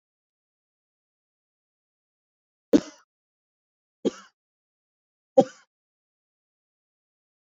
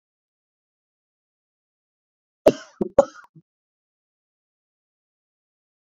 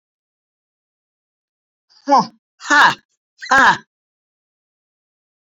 {"three_cough_length": "7.5 s", "three_cough_amplitude": 24466, "three_cough_signal_mean_std_ratio": 0.11, "cough_length": "5.8 s", "cough_amplitude": 28088, "cough_signal_mean_std_ratio": 0.12, "exhalation_length": "5.5 s", "exhalation_amplitude": 29395, "exhalation_signal_mean_std_ratio": 0.28, "survey_phase": "beta (2021-08-13 to 2022-03-07)", "age": "45-64", "gender": "Female", "wearing_mask": "No", "symptom_cough_any": true, "symptom_sore_throat": true, "symptom_abdominal_pain": true, "symptom_diarrhoea": true, "symptom_fatigue": true, "symptom_headache": true, "symptom_onset": "4 days", "smoker_status": "Ex-smoker", "respiratory_condition_asthma": false, "respiratory_condition_other": false, "recruitment_source": "REACT", "submission_delay": "1 day", "covid_test_result": "Negative", "covid_test_method": "RT-qPCR"}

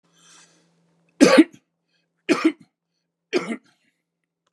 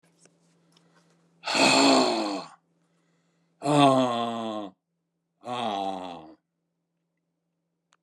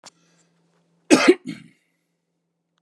{"three_cough_length": "4.5 s", "three_cough_amplitude": 32720, "three_cough_signal_mean_std_ratio": 0.26, "exhalation_length": "8.0 s", "exhalation_amplitude": 15291, "exhalation_signal_mean_std_ratio": 0.42, "cough_length": "2.8 s", "cough_amplitude": 32443, "cough_signal_mean_std_ratio": 0.23, "survey_phase": "beta (2021-08-13 to 2022-03-07)", "age": "65+", "gender": "Male", "wearing_mask": "No", "symptom_none": true, "smoker_status": "Ex-smoker", "respiratory_condition_asthma": false, "respiratory_condition_other": false, "recruitment_source": "REACT", "submission_delay": "1 day", "covid_test_result": "Negative", "covid_test_method": "RT-qPCR", "covid_ct_value": 43.0, "covid_ct_gene": "N gene"}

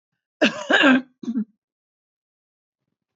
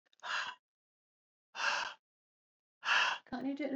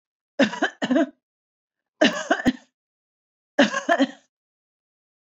{"cough_length": "3.2 s", "cough_amplitude": 20362, "cough_signal_mean_std_ratio": 0.35, "exhalation_length": "3.8 s", "exhalation_amplitude": 4241, "exhalation_signal_mean_std_ratio": 0.48, "three_cough_length": "5.2 s", "three_cough_amplitude": 19648, "three_cough_signal_mean_std_ratio": 0.36, "survey_phase": "beta (2021-08-13 to 2022-03-07)", "age": "45-64", "gender": "Female", "wearing_mask": "No", "symptom_none": true, "smoker_status": "Ex-smoker", "respiratory_condition_asthma": false, "respiratory_condition_other": false, "recruitment_source": "REACT", "submission_delay": "4 days", "covid_test_result": "Negative", "covid_test_method": "RT-qPCR", "influenza_a_test_result": "Negative", "influenza_b_test_result": "Negative"}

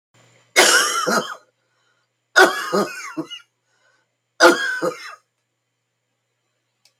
{"three_cough_length": "7.0 s", "three_cough_amplitude": 32768, "three_cough_signal_mean_std_ratio": 0.37, "survey_phase": "beta (2021-08-13 to 2022-03-07)", "age": "65+", "gender": "Female", "wearing_mask": "No", "symptom_cough_any": true, "symptom_runny_or_blocked_nose": true, "symptom_sore_throat": true, "symptom_onset": "2 days", "smoker_status": "Ex-smoker", "respiratory_condition_asthma": false, "respiratory_condition_other": false, "recruitment_source": "Test and Trace", "submission_delay": "1 day", "covid_test_result": "Positive", "covid_test_method": "RT-qPCR", "covid_ct_value": 17.9, "covid_ct_gene": "N gene"}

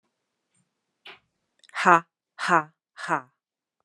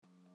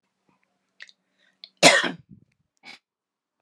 {"exhalation_length": "3.8 s", "exhalation_amplitude": 26867, "exhalation_signal_mean_std_ratio": 0.24, "three_cough_length": "0.3 s", "three_cough_amplitude": 63, "three_cough_signal_mean_std_ratio": 1.28, "cough_length": "3.4 s", "cough_amplitude": 32767, "cough_signal_mean_std_ratio": 0.21, "survey_phase": "alpha (2021-03-01 to 2021-08-12)", "age": "45-64", "gender": "Female", "wearing_mask": "No", "symptom_none": true, "smoker_status": "Never smoked", "respiratory_condition_asthma": false, "respiratory_condition_other": false, "recruitment_source": "Test and Trace", "submission_delay": "2 days", "covid_test_result": "Positive", "covid_test_method": "RT-qPCR", "covid_ct_value": 37.8, "covid_ct_gene": "ORF1ab gene"}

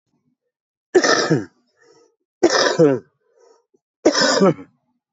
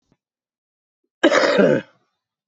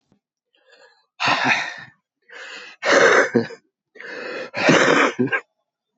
{"three_cough_length": "5.1 s", "three_cough_amplitude": 26110, "three_cough_signal_mean_std_ratio": 0.42, "cough_length": "2.5 s", "cough_amplitude": 25644, "cough_signal_mean_std_ratio": 0.39, "exhalation_length": "6.0 s", "exhalation_amplitude": 25694, "exhalation_signal_mean_std_ratio": 0.48, "survey_phase": "beta (2021-08-13 to 2022-03-07)", "age": "45-64", "gender": "Male", "wearing_mask": "No", "symptom_new_continuous_cough": true, "symptom_runny_or_blocked_nose": true, "symptom_fatigue": true, "symptom_headache": true, "symptom_change_to_sense_of_smell_or_taste": true, "symptom_loss_of_taste": true, "symptom_other": true, "symptom_onset": "5 days", "smoker_status": "Never smoked", "respiratory_condition_asthma": false, "respiratory_condition_other": false, "recruitment_source": "Test and Trace", "submission_delay": "1 day", "covid_test_result": "Positive", "covid_test_method": "RT-qPCR", "covid_ct_value": 18.4, "covid_ct_gene": "ORF1ab gene"}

